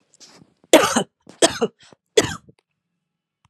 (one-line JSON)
{"three_cough_length": "3.5 s", "three_cough_amplitude": 32768, "three_cough_signal_mean_std_ratio": 0.28, "survey_phase": "alpha (2021-03-01 to 2021-08-12)", "age": "45-64", "gender": "Female", "wearing_mask": "No", "symptom_cough_any": true, "symptom_fatigue": true, "symptom_headache": true, "symptom_change_to_sense_of_smell_or_taste": true, "symptom_onset": "5 days", "smoker_status": "Never smoked", "respiratory_condition_asthma": false, "respiratory_condition_other": false, "recruitment_source": "Test and Trace", "submission_delay": "2 days", "covid_test_result": "Positive", "covid_test_method": "RT-qPCR", "covid_ct_value": 15.6, "covid_ct_gene": "N gene", "covid_ct_mean": 15.7, "covid_viral_load": "6900000 copies/ml", "covid_viral_load_category": "High viral load (>1M copies/ml)"}